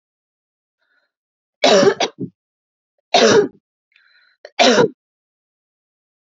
{"three_cough_length": "6.4 s", "three_cough_amplitude": 32768, "three_cough_signal_mean_std_ratio": 0.33, "survey_phase": "alpha (2021-03-01 to 2021-08-12)", "age": "18-44", "gender": "Female", "wearing_mask": "No", "symptom_none": true, "smoker_status": "Never smoked", "respiratory_condition_asthma": true, "respiratory_condition_other": false, "recruitment_source": "REACT", "submission_delay": "1 day", "covid_test_result": "Negative", "covid_test_method": "RT-qPCR"}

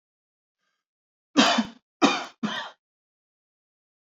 {"three_cough_length": "4.2 s", "three_cough_amplitude": 22484, "three_cough_signal_mean_std_ratio": 0.29, "survey_phase": "beta (2021-08-13 to 2022-03-07)", "age": "18-44", "gender": "Male", "wearing_mask": "No", "symptom_none": true, "smoker_status": "Ex-smoker", "respiratory_condition_asthma": false, "respiratory_condition_other": false, "recruitment_source": "REACT", "submission_delay": "2 days", "covid_test_result": "Negative", "covid_test_method": "RT-qPCR", "influenza_a_test_result": "Negative", "influenza_b_test_result": "Negative"}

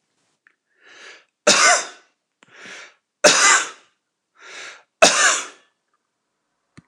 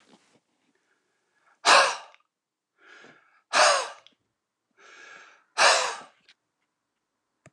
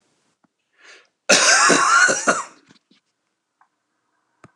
{"three_cough_length": "6.9 s", "three_cough_amplitude": 29204, "three_cough_signal_mean_std_ratio": 0.34, "exhalation_length": "7.5 s", "exhalation_amplitude": 19865, "exhalation_signal_mean_std_ratio": 0.28, "cough_length": "4.6 s", "cough_amplitude": 29204, "cough_signal_mean_std_ratio": 0.41, "survey_phase": "beta (2021-08-13 to 2022-03-07)", "age": "65+", "gender": "Male", "wearing_mask": "No", "symptom_none": true, "smoker_status": "Ex-smoker", "respiratory_condition_asthma": false, "respiratory_condition_other": false, "recruitment_source": "REACT", "submission_delay": "2 days", "covid_test_result": "Negative", "covid_test_method": "RT-qPCR", "influenza_a_test_result": "Negative", "influenza_b_test_result": "Negative"}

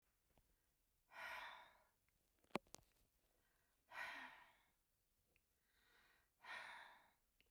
{"exhalation_length": "7.5 s", "exhalation_amplitude": 1518, "exhalation_signal_mean_std_ratio": 0.37, "survey_phase": "beta (2021-08-13 to 2022-03-07)", "age": "65+", "gender": "Female", "wearing_mask": "No", "symptom_none": true, "smoker_status": "Ex-smoker", "respiratory_condition_asthma": true, "respiratory_condition_other": false, "recruitment_source": "REACT", "submission_delay": "1 day", "covid_test_result": "Negative", "covid_test_method": "RT-qPCR", "influenza_a_test_result": "Negative", "influenza_b_test_result": "Negative"}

